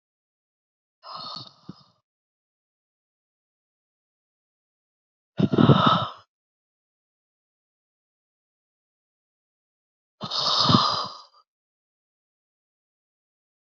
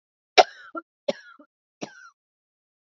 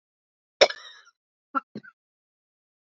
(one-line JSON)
{"exhalation_length": "13.7 s", "exhalation_amplitude": 26294, "exhalation_signal_mean_std_ratio": 0.24, "three_cough_length": "2.8 s", "three_cough_amplitude": 28130, "three_cough_signal_mean_std_ratio": 0.16, "cough_length": "3.0 s", "cough_amplitude": 29855, "cough_signal_mean_std_ratio": 0.15, "survey_phase": "beta (2021-08-13 to 2022-03-07)", "age": "45-64", "gender": "Female", "wearing_mask": "No", "symptom_new_continuous_cough": true, "symptom_runny_or_blocked_nose": true, "symptom_fatigue": true, "symptom_headache": true, "symptom_change_to_sense_of_smell_or_taste": true, "symptom_other": true, "smoker_status": "Never smoked", "respiratory_condition_asthma": false, "respiratory_condition_other": false, "recruitment_source": "Test and Trace", "submission_delay": "2 days", "covid_test_result": "Positive", "covid_test_method": "RT-qPCR", "covid_ct_value": 16.1, "covid_ct_gene": "ORF1ab gene", "covid_ct_mean": 17.3, "covid_viral_load": "2100000 copies/ml", "covid_viral_load_category": "High viral load (>1M copies/ml)"}